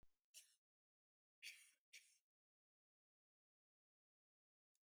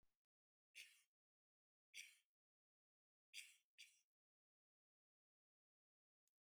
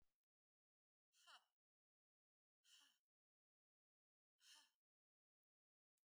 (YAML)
cough_length: 4.9 s
cough_amplitude: 209
cough_signal_mean_std_ratio: 0.25
three_cough_length: 6.5 s
three_cough_amplitude: 270
three_cough_signal_mean_std_ratio: 0.24
exhalation_length: 6.1 s
exhalation_amplitude: 76
exhalation_signal_mean_std_ratio: 0.27
survey_phase: beta (2021-08-13 to 2022-03-07)
age: 65+
gender: Female
wearing_mask: 'No'
symptom_none: true
smoker_status: Never smoked
respiratory_condition_asthma: false
respiratory_condition_other: false
recruitment_source: REACT
submission_delay: 1 day
covid_test_result: Negative
covid_test_method: RT-qPCR
influenza_a_test_result: Unknown/Void
influenza_b_test_result: Unknown/Void